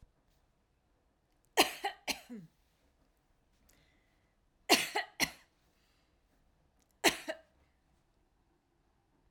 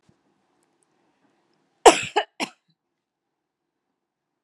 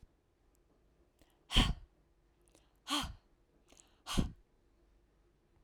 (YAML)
three_cough_length: 9.3 s
three_cough_amplitude: 10784
three_cough_signal_mean_std_ratio: 0.22
cough_length: 4.4 s
cough_amplitude: 32767
cough_signal_mean_std_ratio: 0.15
exhalation_length: 5.6 s
exhalation_amplitude: 7533
exhalation_signal_mean_std_ratio: 0.26
survey_phase: alpha (2021-03-01 to 2021-08-12)
age: 18-44
gender: Female
wearing_mask: 'No'
symptom_fatigue: true
symptom_onset: 12 days
smoker_status: Ex-smoker
respiratory_condition_asthma: false
respiratory_condition_other: false
recruitment_source: REACT
submission_delay: 1 day
covid_test_result: Negative
covid_test_method: RT-qPCR